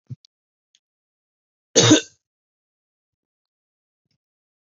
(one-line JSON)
{"cough_length": "4.8 s", "cough_amplitude": 31470, "cough_signal_mean_std_ratio": 0.18, "survey_phase": "beta (2021-08-13 to 2022-03-07)", "age": "18-44", "gender": "Male", "wearing_mask": "No", "symptom_none": true, "smoker_status": "Ex-smoker", "respiratory_condition_asthma": false, "respiratory_condition_other": false, "recruitment_source": "REACT", "submission_delay": "2 days", "covid_test_result": "Negative", "covid_test_method": "RT-qPCR", "influenza_a_test_result": "Negative", "influenza_b_test_result": "Negative"}